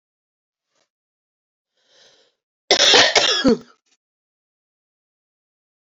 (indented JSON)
{
  "cough_length": "5.9 s",
  "cough_amplitude": 31850,
  "cough_signal_mean_std_ratio": 0.29,
  "survey_phase": "beta (2021-08-13 to 2022-03-07)",
  "age": "18-44",
  "gender": "Female",
  "wearing_mask": "No",
  "symptom_cough_any": true,
  "symptom_runny_or_blocked_nose": true,
  "symptom_diarrhoea": true,
  "symptom_other": true,
  "smoker_status": "Never smoked",
  "respiratory_condition_asthma": false,
  "respiratory_condition_other": false,
  "recruitment_source": "Test and Trace",
  "submission_delay": "13 days",
  "covid_test_result": "Negative",
  "covid_test_method": "RT-qPCR"
}